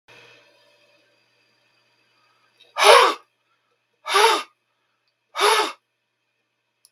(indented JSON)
{
  "exhalation_length": "6.9 s",
  "exhalation_amplitude": 32768,
  "exhalation_signal_mean_std_ratio": 0.29,
  "survey_phase": "beta (2021-08-13 to 2022-03-07)",
  "age": "65+",
  "gender": "Male",
  "wearing_mask": "No",
  "symptom_cough_any": true,
  "symptom_new_continuous_cough": true,
  "symptom_runny_or_blocked_nose": true,
  "symptom_sore_throat": true,
  "symptom_headache": true,
  "symptom_onset": "11 days",
  "smoker_status": "Never smoked",
  "respiratory_condition_asthma": false,
  "respiratory_condition_other": false,
  "recruitment_source": "REACT",
  "submission_delay": "1 day",
  "covid_test_result": "Negative",
  "covid_test_method": "RT-qPCR",
  "influenza_a_test_result": "Unknown/Void",
  "influenza_b_test_result": "Unknown/Void"
}